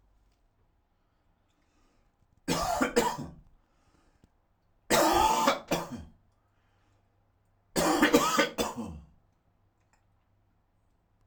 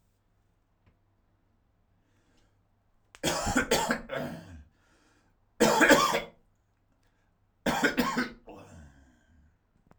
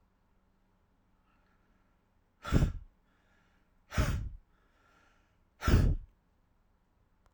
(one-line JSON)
{"three_cough_length": "11.3 s", "three_cough_amplitude": 14214, "three_cough_signal_mean_std_ratio": 0.38, "cough_length": "10.0 s", "cough_amplitude": 20146, "cough_signal_mean_std_ratio": 0.35, "exhalation_length": "7.3 s", "exhalation_amplitude": 8496, "exhalation_signal_mean_std_ratio": 0.29, "survey_phase": "alpha (2021-03-01 to 2021-08-12)", "age": "45-64", "gender": "Male", "wearing_mask": "No", "symptom_cough_any": true, "symptom_new_continuous_cough": true, "symptom_diarrhoea": true, "symptom_fatigue": true, "symptom_headache": true, "symptom_change_to_sense_of_smell_or_taste": true, "symptom_loss_of_taste": true, "smoker_status": "Ex-smoker", "respiratory_condition_asthma": false, "respiratory_condition_other": false, "recruitment_source": "Test and Trace", "submission_delay": "2 days", "covid_test_result": "Positive", "covid_test_method": "RT-qPCR", "covid_ct_value": 29.3, "covid_ct_gene": "ORF1ab gene", "covid_ct_mean": 30.2, "covid_viral_load": "120 copies/ml", "covid_viral_load_category": "Minimal viral load (< 10K copies/ml)"}